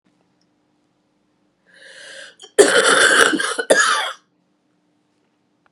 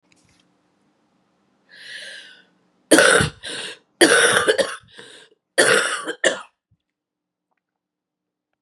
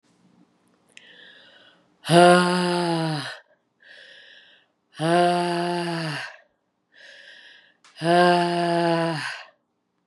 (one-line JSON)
{"cough_length": "5.7 s", "cough_amplitude": 32768, "cough_signal_mean_std_ratio": 0.39, "three_cough_length": "8.6 s", "three_cough_amplitude": 32768, "three_cough_signal_mean_std_ratio": 0.36, "exhalation_length": "10.1 s", "exhalation_amplitude": 27303, "exhalation_signal_mean_std_ratio": 0.46, "survey_phase": "beta (2021-08-13 to 2022-03-07)", "age": "45-64", "gender": "Female", "wearing_mask": "No", "symptom_cough_any": true, "symptom_new_continuous_cough": true, "symptom_runny_or_blocked_nose": true, "symptom_shortness_of_breath": true, "symptom_sore_throat": true, "symptom_fatigue": true, "symptom_fever_high_temperature": true, "symptom_headache": true, "symptom_change_to_sense_of_smell_or_taste": true, "symptom_loss_of_taste": true, "symptom_onset": "3 days", "smoker_status": "Ex-smoker", "respiratory_condition_asthma": false, "respiratory_condition_other": false, "recruitment_source": "Test and Trace", "submission_delay": "2 days", "covid_test_result": "Positive", "covid_test_method": "RT-qPCR", "covid_ct_value": 16.2, "covid_ct_gene": "N gene", "covid_ct_mean": 16.5, "covid_viral_load": "4000000 copies/ml", "covid_viral_load_category": "High viral load (>1M copies/ml)"}